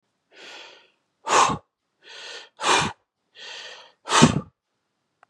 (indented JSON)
{
  "exhalation_length": "5.3 s",
  "exhalation_amplitude": 30947,
  "exhalation_signal_mean_std_ratio": 0.34,
  "survey_phase": "beta (2021-08-13 to 2022-03-07)",
  "age": "45-64",
  "gender": "Male",
  "wearing_mask": "No",
  "symptom_none": true,
  "smoker_status": "Never smoked",
  "respiratory_condition_asthma": false,
  "respiratory_condition_other": false,
  "recruitment_source": "REACT",
  "submission_delay": "1 day",
  "covid_test_result": "Negative",
  "covid_test_method": "RT-qPCR",
  "influenza_a_test_result": "Negative",
  "influenza_b_test_result": "Negative"
}